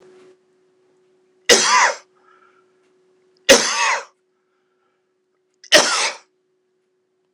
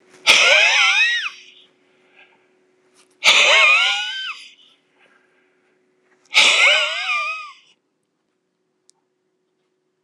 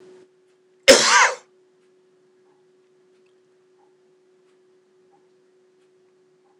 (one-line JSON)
{"three_cough_length": "7.3 s", "three_cough_amplitude": 26028, "three_cough_signal_mean_std_ratio": 0.32, "exhalation_length": "10.0 s", "exhalation_amplitude": 26028, "exhalation_signal_mean_std_ratio": 0.45, "cough_length": "6.6 s", "cough_amplitude": 26028, "cough_signal_mean_std_ratio": 0.21, "survey_phase": "beta (2021-08-13 to 2022-03-07)", "age": "65+", "gender": "Male", "wearing_mask": "No", "symptom_cough_any": true, "smoker_status": "Ex-smoker", "respiratory_condition_asthma": false, "respiratory_condition_other": false, "recruitment_source": "REACT", "submission_delay": "1 day", "covid_test_result": "Negative", "covid_test_method": "RT-qPCR", "influenza_a_test_result": "Negative", "influenza_b_test_result": "Negative"}